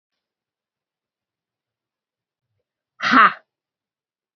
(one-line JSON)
{"exhalation_length": "4.4 s", "exhalation_amplitude": 30154, "exhalation_signal_mean_std_ratio": 0.19, "survey_phase": "beta (2021-08-13 to 2022-03-07)", "age": "45-64", "gender": "Female", "wearing_mask": "No", "symptom_cough_any": true, "symptom_runny_or_blocked_nose": true, "symptom_fatigue": true, "symptom_headache": true, "symptom_change_to_sense_of_smell_or_taste": true, "symptom_loss_of_taste": true, "symptom_other": true, "symptom_onset": "4 days", "smoker_status": "Never smoked", "respiratory_condition_asthma": false, "respiratory_condition_other": false, "recruitment_source": "Test and Trace", "submission_delay": "2 days", "covid_test_result": "Positive", "covid_test_method": "RT-qPCR", "covid_ct_value": 19.0, "covid_ct_gene": "ORF1ab gene"}